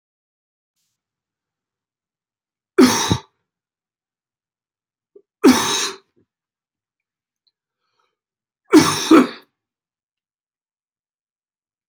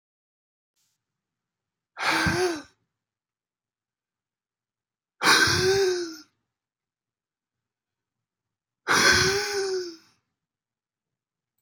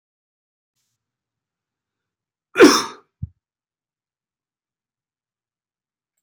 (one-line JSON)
{"three_cough_length": "11.9 s", "three_cough_amplitude": 28678, "three_cough_signal_mean_std_ratio": 0.23, "exhalation_length": "11.6 s", "exhalation_amplitude": 17790, "exhalation_signal_mean_std_ratio": 0.37, "cough_length": "6.2 s", "cough_amplitude": 28883, "cough_signal_mean_std_ratio": 0.15, "survey_phase": "beta (2021-08-13 to 2022-03-07)", "age": "45-64", "gender": "Male", "wearing_mask": "No", "symptom_cough_any": true, "symptom_runny_or_blocked_nose": true, "symptom_sore_throat": true, "symptom_onset": "3 days", "smoker_status": "Never smoked", "respiratory_condition_asthma": true, "respiratory_condition_other": false, "recruitment_source": "Test and Trace", "submission_delay": "2 days", "covid_test_result": "Positive", "covid_test_method": "RT-qPCR", "covid_ct_value": 18.3, "covid_ct_gene": "ORF1ab gene", "covid_ct_mean": 19.2, "covid_viral_load": "510000 copies/ml", "covid_viral_load_category": "Low viral load (10K-1M copies/ml)"}